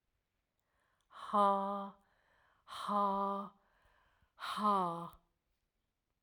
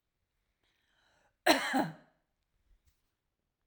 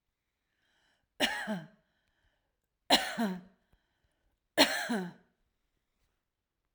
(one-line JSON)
{"exhalation_length": "6.2 s", "exhalation_amplitude": 3538, "exhalation_signal_mean_std_ratio": 0.44, "cough_length": "3.7 s", "cough_amplitude": 10023, "cough_signal_mean_std_ratio": 0.24, "three_cough_length": "6.7 s", "three_cough_amplitude": 13352, "three_cough_signal_mean_std_ratio": 0.3, "survey_phase": "alpha (2021-03-01 to 2021-08-12)", "age": "45-64", "gender": "Female", "wearing_mask": "No", "symptom_none": true, "smoker_status": "Never smoked", "respiratory_condition_asthma": false, "respiratory_condition_other": false, "recruitment_source": "REACT", "submission_delay": "1 day", "covid_test_result": "Negative", "covid_test_method": "RT-qPCR"}